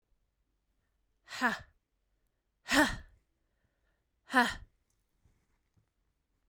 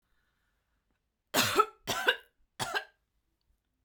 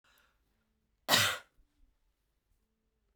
exhalation_length: 6.5 s
exhalation_amplitude: 7590
exhalation_signal_mean_std_ratio: 0.24
three_cough_length: 3.8 s
three_cough_amplitude: 10389
three_cough_signal_mean_std_ratio: 0.32
cough_length: 3.2 s
cough_amplitude: 10213
cough_signal_mean_std_ratio: 0.23
survey_phase: beta (2021-08-13 to 2022-03-07)
age: 18-44
gender: Female
wearing_mask: 'No'
symptom_none: true
smoker_status: Never smoked
respiratory_condition_asthma: false
respiratory_condition_other: false
recruitment_source: REACT
submission_delay: 2 days
covid_test_result: Negative
covid_test_method: RT-qPCR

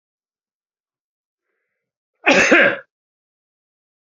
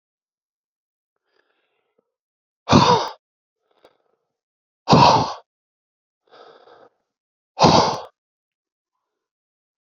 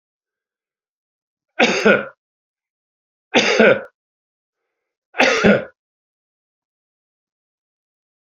cough_length: 4.0 s
cough_amplitude: 28602
cough_signal_mean_std_ratio: 0.28
exhalation_length: 9.9 s
exhalation_amplitude: 28993
exhalation_signal_mean_std_ratio: 0.27
three_cough_length: 8.3 s
three_cough_amplitude: 29305
three_cough_signal_mean_std_ratio: 0.3
survey_phase: beta (2021-08-13 to 2022-03-07)
age: 65+
gender: Male
wearing_mask: 'No'
symptom_none: true
smoker_status: Never smoked
respiratory_condition_asthma: true
respiratory_condition_other: false
recruitment_source: REACT
submission_delay: 2 days
covid_test_result: Negative
covid_test_method: RT-qPCR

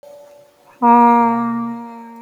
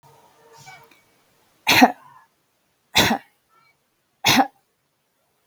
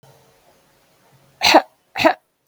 exhalation_length: 2.2 s
exhalation_amplitude: 31286
exhalation_signal_mean_std_ratio: 0.57
three_cough_length: 5.5 s
three_cough_amplitude: 32768
three_cough_signal_mean_std_ratio: 0.27
cough_length: 2.5 s
cough_amplitude: 32768
cough_signal_mean_std_ratio: 0.29
survey_phase: beta (2021-08-13 to 2022-03-07)
age: 45-64
gender: Female
wearing_mask: 'No'
symptom_none: true
smoker_status: Never smoked
respiratory_condition_asthma: false
respiratory_condition_other: false
recruitment_source: REACT
submission_delay: 2 days
covid_test_result: Negative
covid_test_method: RT-qPCR
influenza_a_test_result: Negative
influenza_b_test_result: Negative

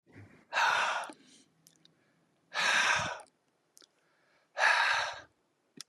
exhalation_length: 5.9 s
exhalation_amplitude: 7405
exhalation_signal_mean_std_ratio: 0.46
survey_phase: beta (2021-08-13 to 2022-03-07)
age: 65+
gender: Male
wearing_mask: 'No'
symptom_headache: true
smoker_status: Never smoked
respiratory_condition_asthma: false
respiratory_condition_other: false
recruitment_source: Test and Trace
submission_delay: 1 day
covid_test_result: Negative
covid_test_method: RT-qPCR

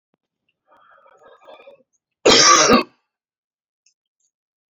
cough_length: 4.7 s
cough_amplitude: 32768
cough_signal_mean_std_ratio: 0.29
survey_phase: alpha (2021-03-01 to 2021-08-12)
age: 45-64
gender: Female
wearing_mask: 'No'
symptom_fatigue: true
symptom_headache: true
symptom_onset: 12 days
smoker_status: Current smoker (1 to 10 cigarettes per day)
respiratory_condition_asthma: false
respiratory_condition_other: false
recruitment_source: REACT
submission_delay: 2 days
covid_test_result: Negative
covid_test_method: RT-qPCR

